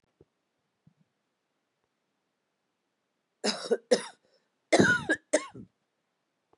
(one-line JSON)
{"cough_length": "6.6 s", "cough_amplitude": 14704, "cough_signal_mean_std_ratio": 0.26, "survey_phase": "beta (2021-08-13 to 2022-03-07)", "age": "45-64", "gender": "Female", "wearing_mask": "No", "symptom_cough_any": true, "symptom_runny_or_blocked_nose": true, "symptom_sore_throat": true, "symptom_diarrhoea": true, "symptom_headache": true, "symptom_other": true, "symptom_onset": "5 days", "smoker_status": "Ex-smoker", "respiratory_condition_asthma": false, "respiratory_condition_other": false, "recruitment_source": "Test and Trace", "submission_delay": "2 days", "covid_test_result": "Positive", "covid_test_method": "RT-qPCR", "covid_ct_value": 22.3, "covid_ct_gene": "N gene"}